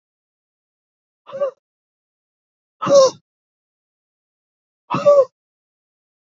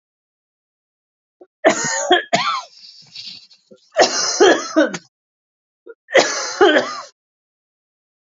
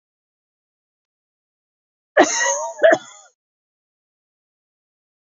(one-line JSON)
{"exhalation_length": "6.3 s", "exhalation_amplitude": 26919, "exhalation_signal_mean_std_ratio": 0.26, "three_cough_length": "8.3 s", "three_cough_amplitude": 29117, "three_cough_signal_mean_std_ratio": 0.41, "cough_length": "5.2 s", "cough_amplitude": 29243, "cough_signal_mean_std_ratio": 0.26, "survey_phase": "alpha (2021-03-01 to 2021-08-12)", "age": "45-64", "gender": "Female", "wearing_mask": "No", "symptom_cough_any": true, "symptom_onset": "8 days", "smoker_status": "Never smoked", "respiratory_condition_asthma": false, "respiratory_condition_other": false, "recruitment_source": "Test and Trace", "submission_delay": "3 days", "covid_test_result": "Positive", "covid_test_method": "RT-qPCR", "covid_ct_value": 30.7, "covid_ct_gene": "N gene", "covid_ct_mean": 31.2, "covid_viral_load": "58 copies/ml", "covid_viral_load_category": "Minimal viral load (< 10K copies/ml)"}